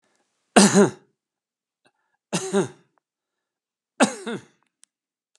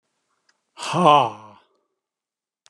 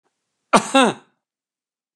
{"three_cough_length": "5.4 s", "three_cough_amplitude": 32767, "three_cough_signal_mean_std_ratio": 0.26, "exhalation_length": "2.7 s", "exhalation_amplitude": 29365, "exhalation_signal_mean_std_ratio": 0.3, "cough_length": "2.0 s", "cough_amplitude": 32767, "cough_signal_mean_std_ratio": 0.28, "survey_phase": "beta (2021-08-13 to 2022-03-07)", "age": "65+", "gender": "Male", "wearing_mask": "No", "symptom_none": true, "symptom_onset": "12 days", "smoker_status": "Ex-smoker", "respiratory_condition_asthma": false, "respiratory_condition_other": false, "recruitment_source": "REACT", "submission_delay": "1 day", "covid_test_result": "Negative", "covid_test_method": "RT-qPCR", "influenza_a_test_result": "Negative", "influenza_b_test_result": "Negative"}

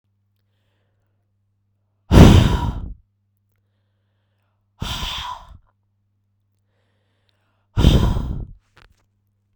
{"exhalation_length": "9.6 s", "exhalation_amplitude": 32768, "exhalation_signal_mean_std_ratio": 0.28, "survey_phase": "beta (2021-08-13 to 2022-03-07)", "age": "18-44", "gender": "Female", "wearing_mask": "No", "symptom_cough_any": true, "symptom_new_continuous_cough": true, "symptom_runny_or_blocked_nose": true, "symptom_sore_throat": true, "symptom_fatigue": true, "symptom_change_to_sense_of_smell_or_taste": true, "symptom_onset": "3 days", "smoker_status": "Ex-smoker", "respiratory_condition_asthma": true, "respiratory_condition_other": false, "recruitment_source": "Test and Trace", "submission_delay": "2 days", "covid_test_result": "Positive", "covid_test_method": "RT-qPCR", "covid_ct_value": 20.9, "covid_ct_gene": "ORF1ab gene", "covid_ct_mean": 21.4, "covid_viral_load": "99000 copies/ml", "covid_viral_load_category": "Low viral load (10K-1M copies/ml)"}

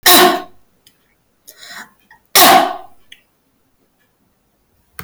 {"cough_length": "5.0 s", "cough_amplitude": 32768, "cough_signal_mean_std_ratio": 0.34, "survey_phase": "alpha (2021-03-01 to 2021-08-12)", "age": "45-64", "gender": "Female", "wearing_mask": "No", "symptom_none": true, "smoker_status": "Never smoked", "respiratory_condition_asthma": false, "respiratory_condition_other": false, "recruitment_source": "REACT", "submission_delay": "2 days", "covid_test_result": "Negative", "covid_test_method": "RT-qPCR"}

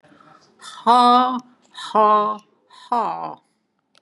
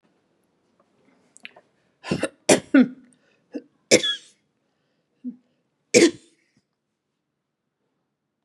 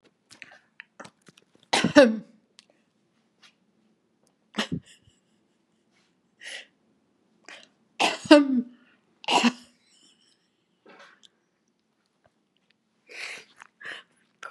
{"exhalation_length": "4.0 s", "exhalation_amplitude": 25117, "exhalation_signal_mean_std_ratio": 0.46, "three_cough_length": "8.4 s", "three_cough_amplitude": 31565, "three_cough_signal_mean_std_ratio": 0.23, "cough_length": "14.5 s", "cough_amplitude": 32144, "cough_signal_mean_std_ratio": 0.22, "survey_phase": "beta (2021-08-13 to 2022-03-07)", "age": "65+", "gender": "Female", "wearing_mask": "No", "symptom_none": true, "smoker_status": "Ex-smoker", "respiratory_condition_asthma": false, "respiratory_condition_other": false, "recruitment_source": "REACT", "submission_delay": "3 days", "covid_test_result": "Negative", "covid_test_method": "RT-qPCR", "influenza_a_test_result": "Negative", "influenza_b_test_result": "Negative"}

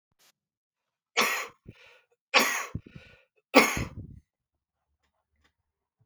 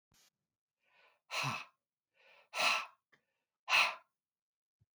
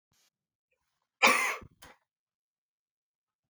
{"three_cough_length": "6.1 s", "three_cough_amplitude": 25554, "three_cough_signal_mean_std_ratio": 0.27, "exhalation_length": "4.9 s", "exhalation_amplitude": 5127, "exhalation_signal_mean_std_ratio": 0.31, "cough_length": "3.5 s", "cough_amplitude": 14831, "cough_signal_mean_std_ratio": 0.23, "survey_phase": "beta (2021-08-13 to 2022-03-07)", "age": "65+", "gender": "Male", "wearing_mask": "No", "symptom_runny_or_blocked_nose": true, "smoker_status": "Never smoked", "respiratory_condition_asthma": false, "respiratory_condition_other": false, "recruitment_source": "REACT", "submission_delay": "2 days", "covid_test_result": "Negative", "covid_test_method": "RT-qPCR", "influenza_a_test_result": "Negative", "influenza_b_test_result": "Negative"}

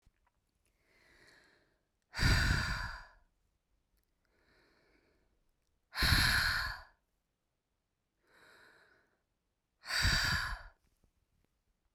{"exhalation_length": "11.9 s", "exhalation_amplitude": 5946, "exhalation_signal_mean_std_ratio": 0.35, "survey_phase": "beta (2021-08-13 to 2022-03-07)", "age": "45-64", "gender": "Female", "wearing_mask": "No", "symptom_cough_any": true, "symptom_runny_or_blocked_nose": true, "symptom_shortness_of_breath": true, "symptom_abdominal_pain": true, "symptom_diarrhoea": true, "symptom_fatigue": true, "symptom_fever_high_temperature": true, "symptom_headache": true, "symptom_change_to_sense_of_smell_or_taste": true, "symptom_onset": "2 days", "smoker_status": "Ex-smoker", "respiratory_condition_asthma": false, "respiratory_condition_other": false, "recruitment_source": "Test and Trace", "submission_delay": "1 day", "covid_test_result": "Positive", "covid_test_method": "RT-qPCR"}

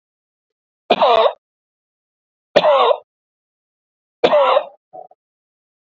{"three_cough_length": "6.0 s", "three_cough_amplitude": 27751, "three_cough_signal_mean_std_ratio": 0.37, "survey_phase": "beta (2021-08-13 to 2022-03-07)", "age": "45-64", "gender": "Male", "wearing_mask": "No", "symptom_cough_any": true, "symptom_fatigue": true, "symptom_headache": true, "symptom_onset": "4 days", "smoker_status": "Current smoker (e-cigarettes or vapes only)", "respiratory_condition_asthma": true, "respiratory_condition_other": false, "recruitment_source": "Test and Trace", "submission_delay": "2 days", "covid_test_result": "Negative", "covid_test_method": "RT-qPCR"}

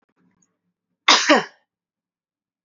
{"cough_length": "2.6 s", "cough_amplitude": 27337, "cough_signal_mean_std_ratio": 0.26, "survey_phase": "beta (2021-08-13 to 2022-03-07)", "age": "45-64", "gender": "Female", "wearing_mask": "No", "symptom_none": true, "smoker_status": "Never smoked", "respiratory_condition_asthma": false, "respiratory_condition_other": false, "recruitment_source": "REACT", "submission_delay": "1 day", "covid_test_result": "Negative", "covid_test_method": "RT-qPCR", "covid_ct_value": 47.0, "covid_ct_gene": "N gene"}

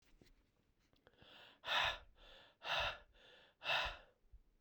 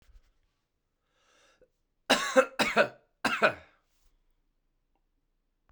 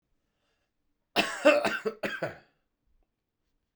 {"exhalation_length": "4.6 s", "exhalation_amplitude": 2264, "exhalation_signal_mean_std_ratio": 0.41, "three_cough_length": "5.7 s", "three_cough_amplitude": 14631, "three_cough_signal_mean_std_ratio": 0.27, "cough_length": "3.8 s", "cough_amplitude": 14181, "cough_signal_mean_std_ratio": 0.32, "survey_phase": "beta (2021-08-13 to 2022-03-07)", "age": "45-64", "gender": "Male", "wearing_mask": "No", "symptom_new_continuous_cough": true, "symptom_runny_or_blocked_nose": true, "symptom_fatigue": true, "symptom_fever_high_temperature": true, "symptom_headache": true, "symptom_change_to_sense_of_smell_or_taste": true, "symptom_loss_of_taste": true, "smoker_status": "Ex-smoker", "respiratory_condition_asthma": false, "respiratory_condition_other": false, "recruitment_source": "Test and Trace", "submission_delay": "2 days", "covid_test_result": "Positive", "covid_test_method": "LFT"}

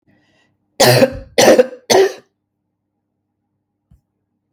{"three_cough_length": "4.5 s", "three_cough_amplitude": 32768, "three_cough_signal_mean_std_ratio": 0.35, "survey_phase": "beta (2021-08-13 to 2022-03-07)", "age": "45-64", "gender": "Female", "wearing_mask": "No", "symptom_cough_any": true, "symptom_runny_or_blocked_nose": true, "symptom_shortness_of_breath": true, "symptom_sore_throat": true, "symptom_fatigue": true, "symptom_onset": "12 days", "smoker_status": "Never smoked", "respiratory_condition_asthma": false, "respiratory_condition_other": false, "recruitment_source": "REACT", "submission_delay": "0 days", "covid_test_result": "Positive", "covid_test_method": "RT-qPCR", "covid_ct_value": 36.9, "covid_ct_gene": "N gene", "influenza_a_test_result": "Negative", "influenza_b_test_result": "Negative"}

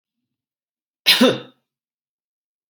{"cough_length": "2.7 s", "cough_amplitude": 31168, "cough_signal_mean_std_ratio": 0.25, "survey_phase": "alpha (2021-03-01 to 2021-08-12)", "age": "18-44", "gender": "Male", "wearing_mask": "No", "symptom_none": true, "smoker_status": "Never smoked", "respiratory_condition_asthma": false, "respiratory_condition_other": false, "recruitment_source": "REACT", "submission_delay": "4 days", "covid_test_result": "Negative", "covid_test_method": "RT-qPCR"}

